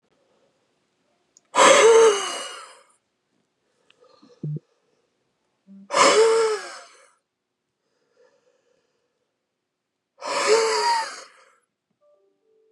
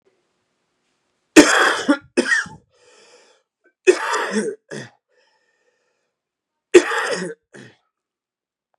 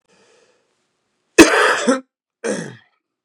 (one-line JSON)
{"exhalation_length": "12.7 s", "exhalation_amplitude": 28541, "exhalation_signal_mean_std_ratio": 0.35, "three_cough_length": "8.8 s", "three_cough_amplitude": 32768, "three_cough_signal_mean_std_ratio": 0.31, "cough_length": "3.2 s", "cough_amplitude": 32768, "cough_signal_mean_std_ratio": 0.33, "survey_phase": "beta (2021-08-13 to 2022-03-07)", "age": "45-64", "gender": "Male", "wearing_mask": "No", "symptom_cough_any": true, "symptom_runny_or_blocked_nose": true, "symptom_shortness_of_breath": true, "symptom_sore_throat": true, "symptom_diarrhoea": true, "symptom_fatigue": true, "symptom_fever_high_temperature": true, "symptom_headache": true, "symptom_change_to_sense_of_smell_or_taste": true, "symptom_loss_of_taste": true, "symptom_other": true, "symptom_onset": "9 days", "smoker_status": "Never smoked", "respiratory_condition_asthma": false, "respiratory_condition_other": false, "recruitment_source": "Test and Trace", "submission_delay": "1 day", "covid_test_result": "Positive", "covid_test_method": "ePCR"}